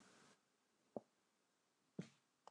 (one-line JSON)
{"three_cough_length": "2.5 s", "three_cough_amplitude": 791, "three_cough_signal_mean_std_ratio": 0.23, "survey_phase": "beta (2021-08-13 to 2022-03-07)", "age": "65+", "gender": "Female", "wearing_mask": "No", "symptom_none": true, "smoker_status": "Never smoked", "respiratory_condition_asthma": true, "respiratory_condition_other": false, "recruitment_source": "REACT", "submission_delay": "3 days", "covid_test_result": "Negative", "covid_test_method": "RT-qPCR"}